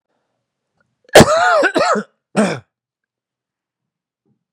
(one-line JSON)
{"cough_length": "4.5 s", "cough_amplitude": 32768, "cough_signal_mean_std_ratio": 0.35, "survey_phase": "beta (2021-08-13 to 2022-03-07)", "age": "45-64", "gender": "Male", "wearing_mask": "No", "symptom_new_continuous_cough": true, "symptom_runny_or_blocked_nose": true, "symptom_sore_throat": true, "symptom_change_to_sense_of_smell_or_taste": true, "symptom_onset": "12 days", "smoker_status": "Never smoked", "respiratory_condition_asthma": false, "respiratory_condition_other": false, "recruitment_source": "REACT", "submission_delay": "1 day", "covid_test_result": "Negative", "covid_test_method": "RT-qPCR", "influenza_a_test_result": "Negative", "influenza_b_test_result": "Negative"}